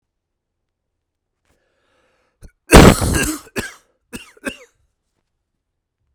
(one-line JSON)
{"cough_length": "6.1 s", "cough_amplitude": 32768, "cough_signal_mean_std_ratio": 0.23, "survey_phase": "beta (2021-08-13 to 2022-03-07)", "age": "45-64", "gender": "Male", "wearing_mask": "No", "symptom_cough_any": true, "symptom_runny_or_blocked_nose": true, "symptom_fatigue": true, "symptom_fever_high_temperature": true, "symptom_change_to_sense_of_smell_or_taste": true, "symptom_loss_of_taste": true, "symptom_onset": "3 days", "smoker_status": "Ex-smoker", "respiratory_condition_asthma": false, "respiratory_condition_other": false, "recruitment_source": "Test and Trace", "submission_delay": "2 days", "covid_test_result": "Positive", "covid_test_method": "RT-qPCR", "covid_ct_value": 16.2, "covid_ct_gene": "ORF1ab gene", "covid_ct_mean": 16.6, "covid_viral_load": "3500000 copies/ml", "covid_viral_load_category": "High viral load (>1M copies/ml)"}